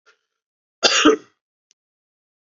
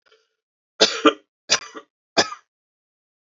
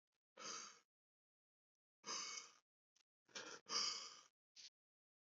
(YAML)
cough_length: 2.5 s
cough_amplitude: 32768
cough_signal_mean_std_ratio: 0.28
three_cough_length: 3.2 s
three_cough_amplitude: 30203
three_cough_signal_mean_std_ratio: 0.26
exhalation_length: 5.2 s
exhalation_amplitude: 1277
exhalation_signal_mean_std_ratio: 0.38
survey_phase: beta (2021-08-13 to 2022-03-07)
age: 18-44
gender: Male
wearing_mask: 'No'
symptom_cough_any: true
symptom_new_continuous_cough: true
symptom_runny_or_blocked_nose: true
symptom_fatigue: true
symptom_fever_high_temperature: true
symptom_headache: true
symptom_change_to_sense_of_smell_or_taste: true
symptom_loss_of_taste: true
smoker_status: Never smoked
respiratory_condition_asthma: true
respiratory_condition_other: false
recruitment_source: Test and Trace
submission_delay: 2 days
covid_test_result: Positive
covid_test_method: RT-qPCR
covid_ct_value: 19.0
covid_ct_gene: ORF1ab gene
covid_ct_mean: 19.7
covid_viral_load: 350000 copies/ml
covid_viral_load_category: Low viral load (10K-1M copies/ml)